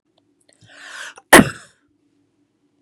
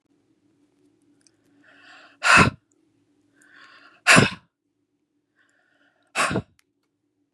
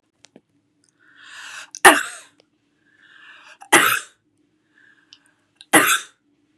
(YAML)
cough_length: 2.8 s
cough_amplitude: 32768
cough_signal_mean_std_ratio: 0.19
exhalation_length: 7.3 s
exhalation_amplitude: 32471
exhalation_signal_mean_std_ratio: 0.24
three_cough_length: 6.6 s
three_cough_amplitude: 32768
three_cough_signal_mean_std_ratio: 0.25
survey_phase: beta (2021-08-13 to 2022-03-07)
age: 45-64
gender: Female
wearing_mask: 'No'
symptom_none: true
smoker_status: Never smoked
respiratory_condition_asthma: false
respiratory_condition_other: false
recruitment_source: REACT
submission_delay: 1 day
covid_test_result: Negative
covid_test_method: RT-qPCR
influenza_a_test_result: Negative
influenza_b_test_result: Negative